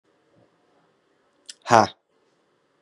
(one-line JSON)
{"exhalation_length": "2.8 s", "exhalation_amplitude": 32731, "exhalation_signal_mean_std_ratio": 0.17, "survey_phase": "beta (2021-08-13 to 2022-03-07)", "age": "18-44", "gender": "Male", "wearing_mask": "No", "symptom_cough_any": true, "symptom_new_continuous_cough": true, "symptom_sore_throat": true, "symptom_fatigue": true, "symptom_fever_high_temperature": true, "smoker_status": "Never smoked", "respiratory_condition_asthma": false, "respiratory_condition_other": false, "recruitment_source": "Test and Trace", "submission_delay": "-1 day", "covid_test_result": "Positive", "covid_test_method": "LFT"}